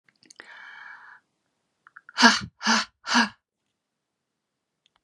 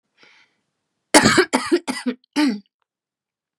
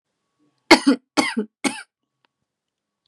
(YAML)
exhalation_length: 5.0 s
exhalation_amplitude: 25443
exhalation_signal_mean_std_ratio: 0.27
cough_length: 3.6 s
cough_amplitude: 32768
cough_signal_mean_std_ratio: 0.37
three_cough_length: 3.1 s
three_cough_amplitude: 32768
three_cough_signal_mean_std_ratio: 0.26
survey_phase: beta (2021-08-13 to 2022-03-07)
age: 18-44
gender: Female
wearing_mask: 'No'
symptom_cough_any: true
symptom_fever_high_temperature: true
smoker_status: Never smoked
respiratory_condition_asthma: false
respiratory_condition_other: false
recruitment_source: Test and Trace
submission_delay: 0 days
covid_test_result: Negative
covid_test_method: LFT